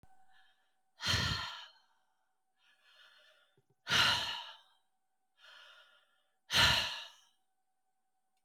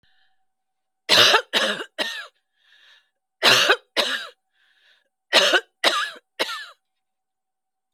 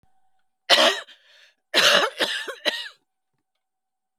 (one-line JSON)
{"exhalation_length": "8.4 s", "exhalation_amplitude": 5767, "exhalation_signal_mean_std_ratio": 0.34, "three_cough_length": "7.9 s", "three_cough_amplitude": 28605, "three_cough_signal_mean_std_ratio": 0.38, "cough_length": "4.2 s", "cough_amplitude": 28584, "cough_signal_mean_std_ratio": 0.38, "survey_phase": "alpha (2021-03-01 to 2021-08-12)", "age": "45-64", "gender": "Female", "wearing_mask": "No", "symptom_none": true, "smoker_status": "Never smoked", "respiratory_condition_asthma": false, "respiratory_condition_other": false, "recruitment_source": "REACT", "submission_delay": "1 day", "covid_test_result": "Negative", "covid_test_method": "RT-qPCR"}